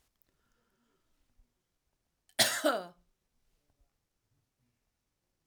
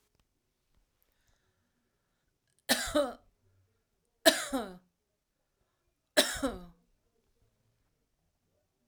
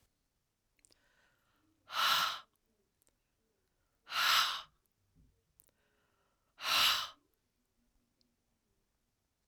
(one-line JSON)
{"cough_length": "5.5 s", "cough_amplitude": 9138, "cough_signal_mean_std_ratio": 0.21, "three_cough_length": "8.9 s", "three_cough_amplitude": 15577, "three_cough_signal_mean_std_ratio": 0.23, "exhalation_length": "9.5 s", "exhalation_amplitude": 4992, "exhalation_signal_mean_std_ratio": 0.3, "survey_phase": "alpha (2021-03-01 to 2021-08-12)", "age": "65+", "gender": "Female", "wearing_mask": "No", "symptom_none": true, "smoker_status": "Never smoked", "respiratory_condition_asthma": false, "respiratory_condition_other": false, "recruitment_source": "REACT", "submission_delay": "1 day", "covid_test_result": "Negative", "covid_test_method": "RT-qPCR"}